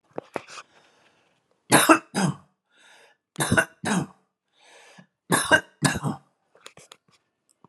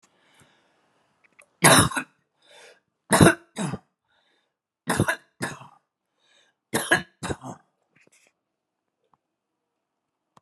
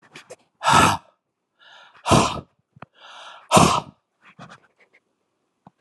{"three_cough_length": "7.7 s", "three_cough_amplitude": 29362, "three_cough_signal_mean_std_ratio": 0.32, "cough_length": "10.4 s", "cough_amplitude": 31793, "cough_signal_mean_std_ratio": 0.25, "exhalation_length": "5.8 s", "exhalation_amplitude": 32524, "exhalation_signal_mean_std_ratio": 0.32, "survey_phase": "alpha (2021-03-01 to 2021-08-12)", "age": "65+", "gender": "Male", "wearing_mask": "No", "symptom_cough_any": true, "smoker_status": "Ex-smoker", "respiratory_condition_asthma": false, "respiratory_condition_other": false, "recruitment_source": "REACT", "submission_delay": "1 day", "covid_test_result": "Negative", "covid_test_method": "RT-qPCR"}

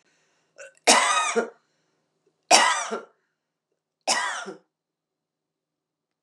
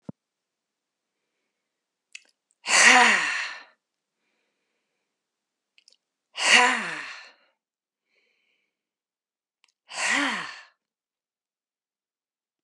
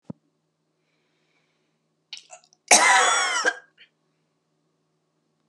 {"three_cough_length": "6.2 s", "three_cough_amplitude": 30707, "three_cough_signal_mean_std_ratio": 0.34, "exhalation_length": "12.6 s", "exhalation_amplitude": 24242, "exhalation_signal_mean_std_ratio": 0.28, "cough_length": "5.5 s", "cough_amplitude": 31137, "cough_signal_mean_std_ratio": 0.3, "survey_phase": "alpha (2021-03-01 to 2021-08-12)", "age": "45-64", "gender": "Female", "wearing_mask": "No", "symptom_cough_any": true, "smoker_status": "Ex-smoker", "respiratory_condition_asthma": true, "respiratory_condition_other": false, "recruitment_source": "REACT", "submission_delay": "1 day", "covid_test_result": "Negative", "covid_test_method": "RT-qPCR"}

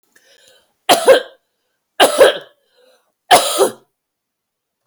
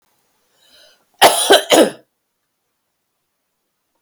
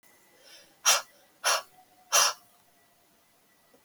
{"three_cough_length": "4.9 s", "three_cough_amplitude": 32768, "three_cough_signal_mean_std_ratio": 0.34, "cough_length": "4.0 s", "cough_amplitude": 32768, "cough_signal_mean_std_ratio": 0.29, "exhalation_length": "3.8 s", "exhalation_amplitude": 12196, "exhalation_signal_mean_std_ratio": 0.31, "survey_phase": "beta (2021-08-13 to 2022-03-07)", "age": "45-64", "gender": "Female", "wearing_mask": "No", "symptom_none": true, "smoker_status": "Never smoked", "respiratory_condition_asthma": true, "respiratory_condition_other": false, "recruitment_source": "REACT", "submission_delay": "2 days", "covid_test_result": "Negative", "covid_test_method": "RT-qPCR", "influenza_a_test_result": "Negative", "influenza_b_test_result": "Negative"}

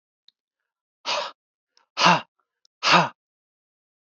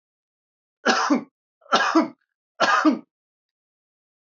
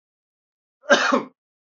{"exhalation_length": "4.1 s", "exhalation_amplitude": 25896, "exhalation_signal_mean_std_ratio": 0.29, "three_cough_length": "4.4 s", "three_cough_amplitude": 19250, "three_cough_signal_mean_std_ratio": 0.39, "cough_length": "1.7 s", "cough_amplitude": 24668, "cough_signal_mean_std_ratio": 0.33, "survey_phase": "beta (2021-08-13 to 2022-03-07)", "age": "45-64", "gender": "Male", "wearing_mask": "No", "symptom_none": true, "smoker_status": "Never smoked", "respiratory_condition_asthma": false, "respiratory_condition_other": false, "recruitment_source": "REACT", "submission_delay": "3 days", "covid_test_result": "Negative", "covid_test_method": "RT-qPCR", "influenza_a_test_result": "Negative", "influenza_b_test_result": "Negative"}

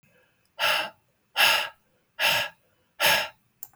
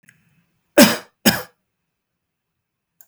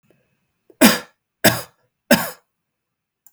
{"exhalation_length": "3.8 s", "exhalation_amplitude": 14578, "exhalation_signal_mean_std_ratio": 0.45, "cough_length": "3.1 s", "cough_amplitude": 32768, "cough_signal_mean_std_ratio": 0.23, "three_cough_length": "3.3 s", "three_cough_amplitude": 32768, "three_cough_signal_mean_std_ratio": 0.27, "survey_phase": "alpha (2021-03-01 to 2021-08-12)", "age": "45-64", "gender": "Male", "wearing_mask": "No", "symptom_none": true, "smoker_status": "Never smoked", "respiratory_condition_asthma": false, "respiratory_condition_other": false, "recruitment_source": "REACT", "submission_delay": "6 days", "covid_test_result": "Negative", "covid_test_method": "RT-qPCR"}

